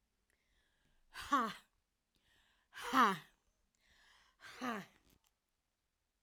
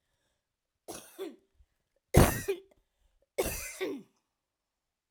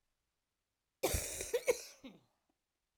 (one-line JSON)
{"exhalation_length": "6.2 s", "exhalation_amplitude": 4182, "exhalation_signal_mean_std_ratio": 0.27, "three_cough_length": "5.1 s", "three_cough_amplitude": 15835, "three_cough_signal_mean_std_ratio": 0.26, "cough_length": "3.0 s", "cough_amplitude": 3355, "cough_signal_mean_std_ratio": 0.34, "survey_phase": "beta (2021-08-13 to 2022-03-07)", "age": "65+", "gender": "Female", "wearing_mask": "No", "symptom_cough_any": true, "symptom_onset": "12 days", "smoker_status": "Ex-smoker", "respiratory_condition_asthma": true, "respiratory_condition_other": true, "recruitment_source": "REACT", "submission_delay": "3 days", "covid_test_result": "Negative", "covid_test_method": "RT-qPCR"}